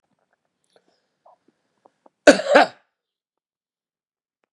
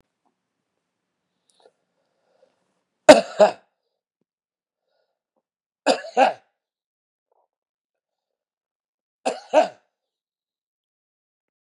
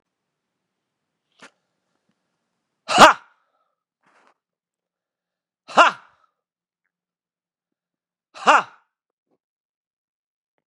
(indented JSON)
{
  "cough_length": "4.5 s",
  "cough_amplitude": 32768,
  "cough_signal_mean_std_ratio": 0.19,
  "three_cough_length": "11.6 s",
  "three_cough_amplitude": 32768,
  "three_cough_signal_mean_std_ratio": 0.17,
  "exhalation_length": "10.7 s",
  "exhalation_amplitude": 32768,
  "exhalation_signal_mean_std_ratio": 0.16,
  "survey_phase": "beta (2021-08-13 to 2022-03-07)",
  "age": "45-64",
  "gender": "Male",
  "wearing_mask": "No",
  "symptom_none": true,
  "smoker_status": "Ex-smoker",
  "respiratory_condition_asthma": false,
  "respiratory_condition_other": true,
  "recruitment_source": "REACT",
  "submission_delay": "2 days",
  "covid_test_result": "Negative",
  "covid_test_method": "RT-qPCR",
  "influenza_a_test_result": "Negative",
  "influenza_b_test_result": "Negative"
}